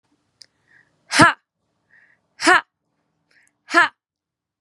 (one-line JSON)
{"exhalation_length": "4.6 s", "exhalation_amplitude": 32767, "exhalation_signal_mean_std_ratio": 0.24, "survey_phase": "beta (2021-08-13 to 2022-03-07)", "age": "18-44", "gender": "Female", "wearing_mask": "No", "symptom_none": true, "symptom_onset": "8 days", "smoker_status": "Ex-smoker", "respiratory_condition_asthma": false, "respiratory_condition_other": false, "recruitment_source": "REACT", "submission_delay": "3 days", "covid_test_result": "Negative", "covid_test_method": "RT-qPCR"}